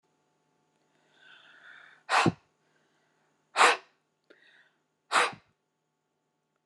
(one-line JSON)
{"exhalation_length": "6.7 s", "exhalation_amplitude": 16084, "exhalation_signal_mean_std_ratio": 0.24, "survey_phase": "beta (2021-08-13 to 2022-03-07)", "age": "45-64", "gender": "Female", "wearing_mask": "No", "symptom_none": true, "smoker_status": "Never smoked", "respiratory_condition_asthma": false, "respiratory_condition_other": false, "recruitment_source": "REACT", "submission_delay": "1 day", "covid_test_result": "Negative", "covid_test_method": "RT-qPCR", "influenza_a_test_result": "Negative", "influenza_b_test_result": "Negative"}